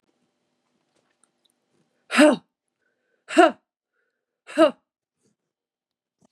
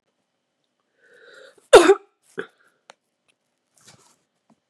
{
  "exhalation_length": "6.3 s",
  "exhalation_amplitude": 28647,
  "exhalation_signal_mean_std_ratio": 0.22,
  "cough_length": "4.7 s",
  "cough_amplitude": 32768,
  "cough_signal_mean_std_ratio": 0.17,
  "survey_phase": "beta (2021-08-13 to 2022-03-07)",
  "age": "18-44",
  "gender": "Female",
  "wearing_mask": "No",
  "symptom_none": true,
  "smoker_status": "Never smoked",
  "respiratory_condition_asthma": true,
  "respiratory_condition_other": false,
  "recruitment_source": "REACT",
  "submission_delay": "6 days",
  "covid_test_result": "Negative",
  "covid_test_method": "RT-qPCR",
  "influenza_a_test_result": "Negative",
  "influenza_b_test_result": "Negative"
}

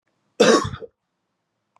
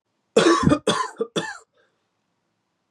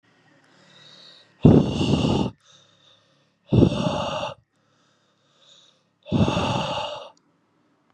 {
  "cough_length": "1.8 s",
  "cough_amplitude": 27805,
  "cough_signal_mean_std_ratio": 0.32,
  "three_cough_length": "2.9 s",
  "three_cough_amplitude": 23527,
  "three_cough_signal_mean_std_ratio": 0.4,
  "exhalation_length": "7.9 s",
  "exhalation_amplitude": 28821,
  "exhalation_signal_mean_std_ratio": 0.4,
  "survey_phase": "beta (2021-08-13 to 2022-03-07)",
  "age": "18-44",
  "gender": "Male",
  "wearing_mask": "No",
  "symptom_none": true,
  "smoker_status": "Never smoked",
  "respiratory_condition_asthma": false,
  "respiratory_condition_other": false,
  "recruitment_source": "REACT",
  "submission_delay": "1 day",
  "covid_test_result": "Negative",
  "covid_test_method": "RT-qPCR",
  "influenza_a_test_result": "Negative",
  "influenza_b_test_result": "Negative"
}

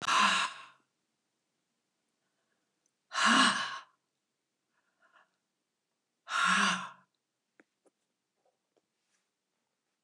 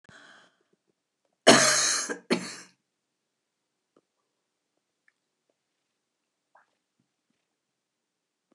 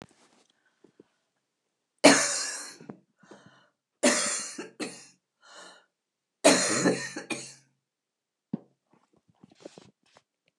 {
  "exhalation_length": "10.0 s",
  "exhalation_amplitude": 7905,
  "exhalation_signal_mean_std_ratio": 0.31,
  "cough_length": "8.5 s",
  "cough_amplitude": 27254,
  "cough_signal_mean_std_ratio": 0.21,
  "three_cough_length": "10.6 s",
  "three_cough_amplitude": 25209,
  "three_cough_signal_mean_std_ratio": 0.29,
  "survey_phase": "beta (2021-08-13 to 2022-03-07)",
  "age": "65+",
  "gender": "Female",
  "wearing_mask": "No",
  "symptom_cough_any": true,
  "symptom_runny_or_blocked_nose": true,
  "symptom_onset": "12 days",
  "smoker_status": "Ex-smoker",
  "respiratory_condition_asthma": false,
  "respiratory_condition_other": false,
  "recruitment_source": "REACT",
  "submission_delay": "2 days",
  "covid_test_result": "Negative",
  "covid_test_method": "RT-qPCR",
  "influenza_a_test_result": "Negative",
  "influenza_b_test_result": "Negative"
}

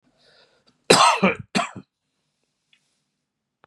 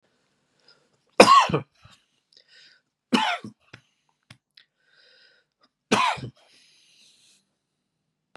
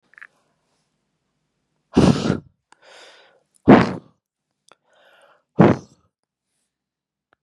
{
  "cough_length": "3.7 s",
  "cough_amplitude": 32767,
  "cough_signal_mean_std_ratio": 0.29,
  "three_cough_length": "8.4 s",
  "three_cough_amplitude": 32768,
  "three_cough_signal_mean_std_ratio": 0.23,
  "exhalation_length": "7.4 s",
  "exhalation_amplitude": 32768,
  "exhalation_signal_mean_std_ratio": 0.23,
  "survey_phase": "beta (2021-08-13 to 2022-03-07)",
  "age": "65+",
  "gender": "Female",
  "wearing_mask": "No",
  "symptom_cough_any": true,
  "symptom_runny_or_blocked_nose": true,
  "symptom_fatigue": true,
  "smoker_status": "Ex-smoker",
  "respiratory_condition_asthma": false,
  "respiratory_condition_other": false,
  "recruitment_source": "Test and Trace",
  "submission_delay": "3 days",
  "covid_test_result": "Positive",
  "covid_test_method": "RT-qPCR",
  "covid_ct_value": 34.3,
  "covid_ct_gene": "ORF1ab gene",
  "covid_ct_mean": 34.6,
  "covid_viral_load": "4.6 copies/ml",
  "covid_viral_load_category": "Minimal viral load (< 10K copies/ml)"
}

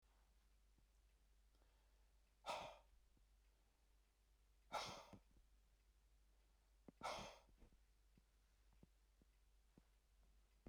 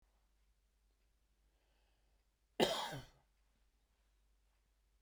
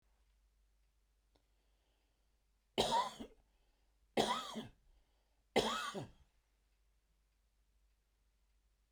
{
  "exhalation_length": "10.7 s",
  "exhalation_amplitude": 556,
  "exhalation_signal_mean_std_ratio": 0.4,
  "cough_length": "5.0 s",
  "cough_amplitude": 4716,
  "cough_signal_mean_std_ratio": 0.21,
  "three_cough_length": "8.9 s",
  "three_cough_amplitude": 4136,
  "three_cough_signal_mean_std_ratio": 0.29,
  "survey_phase": "beta (2021-08-13 to 2022-03-07)",
  "age": "65+",
  "gender": "Male",
  "wearing_mask": "No",
  "symptom_none": true,
  "smoker_status": "Ex-smoker",
  "respiratory_condition_asthma": false,
  "respiratory_condition_other": false,
  "recruitment_source": "REACT",
  "submission_delay": "1 day",
  "covid_test_result": "Negative",
  "covid_test_method": "RT-qPCR"
}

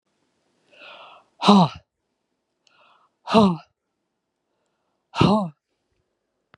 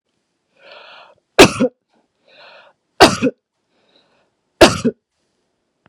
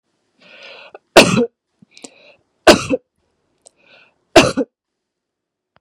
{
  "exhalation_length": "6.6 s",
  "exhalation_amplitude": 30084,
  "exhalation_signal_mean_std_ratio": 0.28,
  "three_cough_length": "5.9 s",
  "three_cough_amplitude": 32768,
  "three_cough_signal_mean_std_ratio": 0.25,
  "cough_length": "5.8 s",
  "cough_amplitude": 32768,
  "cough_signal_mean_std_ratio": 0.26,
  "survey_phase": "beta (2021-08-13 to 2022-03-07)",
  "age": "45-64",
  "gender": "Female",
  "wearing_mask": "No",
  "symptom_none": true,
  "smoker_status": "Never smoked",
  "respiratory_condition_asthma": false,
  "respiratory_condition_other": false,
  "recruitment_source": "REACT",
  "submission_delay": "1 day",
  "covid_test_result": "Negative",
  "covid_test_method": "RT-qPCR",
  "influenza_a_test_result": "Negative",
  "influenza_b_test_result": "Negative"
}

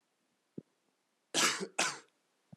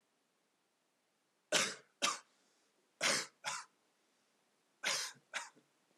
{
  "cough_length": "2.6 s",
  "cough_amplitude": 6658,
  "cough_signal_mean_std_ratio": 0.34,
  "three_cough_length": "6.0 s",
  "three_cough_amplitude": 4457,
  "three_cough_signal_mean_std_ratio": 0.34,
  "survey_phase": "alpha (2021-03-01 to 2021-08-12)",
  "age": "18-44",
  "gender": "Male",
  "wearing_mask": "No",
  "symptom_none": true,
  "smoker_status": "Never smoked",
  "respiratory_condition_asthma": false,
  "respiratory_condition_other": false,
  "recruitment_source": "REACT",
  "submission_delay": "1 day",
  "covid_test_result": "Negative",
  "covid_test_method": "RT-qPCR"
}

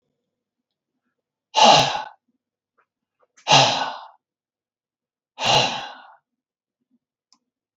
{
  "exhalation_length": "7.8 s",
  "exhalation_amplitude": 32766,
  "exhalation_signal_mean_std_ratio": 0.3,
  "survey_phase": "beta (2021-08-13 to 2022-03-07)",
  "age": "65+",
  "gender": "Male",
  "wearing_mask": "No",
  "symptom_none": true,
  "smoker_status": "Never smoked",
  "respiratory_condition_asthma": false,
  "respiratory_condition_other": false,
  "recruitment_source": "REACT",
  "submission_delay": "3 days",
  "covid_test_result": "Negative",
  "covid_test_method": "RT-qPCR",
  "influenza_a_test_result": "Negative",
  "influenza_b_test_result": "Negative"
}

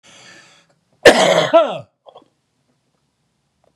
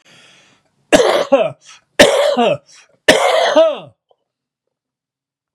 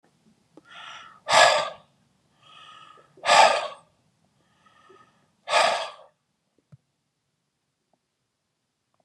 {
  "cough_length": "3.8 s",
  "cough_amplitude": 32768,
  "cough_signal_mean_std_ratio": 0.32,
  "three_cough_length": "5.5 s",
  "three_cough_amplitude": 32768,
  "three_cough_signal_mean_std_ratio": 0.46,
  "exhalation_length": "9.0 s",
  "exhalation_amplitude": 28666,
  "exhalation_signal_mean_std_ratio": 0.28,
  "survey_phase": "beta (2021-08-13 to 2022-03-07)",
  "age": "65+",
  "gender": "Male",
  "wearing_mask": "No",
  "symptom_none": true,
  "smoker_status": "Ex-smoker",
  "respiratory_condition_asthma": true,
  "respiratory_condition_other": false,
  "recruitment_source": "REACT",
  "submission_delay": "3 days",
  "covid_test_result": "Negative",
  "covid_test_method": "RT-qPCR",
  "influenza_a_test_result": "Negative",
  "influenza_b_test_result": "Negative"
}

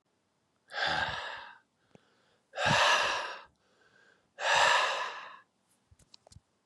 {
  "exhalation_length": "6.7 s",
  "exhalation_amplitude": 8238,
  "exhalation_signal_mean_std_ratio": 0.45,
  "survey_phase": "beta (2021-08-13 to 2022-03-07)",
  "age": "18-44",
  "gender": "Male",
  "wearing_mask": "No",
  "symptom_cough_any": true,
  "symptom_shortness_of_breath": true,
  "symptom_sore_throat": true,
  "symptom_fatigue": true,
  "symptom_onset": "2 days",
  "smoker_status": "Ex-smoker",
  "respiratory_condition_asthma": true,
  "respiratory_condition_other": false,
  "recruitment_source": "Test and Trace",
  "submission_delay": "2 days",
  "covid_test_result": "Positive",
  "covid_test_method": "RT-qPCR",
  "covid_ct_value": 19.3,
  "covid_ct_gene": "ORF1ab gene",
  "covid_ct_mean": 19.7,
  "covid_viral_load": "340000 copies/ml",
  "covid_viral_load_category": "Low viral load (10K-1M copies/ml)"
}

